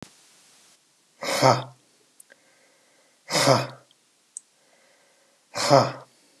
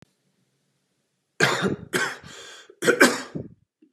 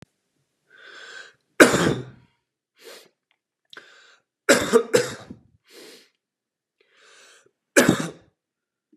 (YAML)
exhalation_length: 6.4 s
exhalation_amplitude: 26698
exhalation_signal_mean_std_ratio: 0.31
cough_length: 3.9 s
cough_amplitude: 27848
cough_signal_mean_std_ratio: 0.37
three_cough_length: 9.0 s
three_cough_amplitude: 32768
three_cough_signal_mean_std_ratio: 0.26
survey_phase: beta (2021-08-13 to 2022-03-07)
age: 45-64
gender: Male
wearing_mask: 'No'
symptom_none: true
smoker_status: Never smoked
respiratory_condition_asthma: false
respiratory_condition_other: false
recruitment_source: REACT
submission_delay: 2 days
covid_test_result: Negative
covid_test_method: RT-qPCR
influenza_a_test_result: Negative
influenza_b_test_result: Negative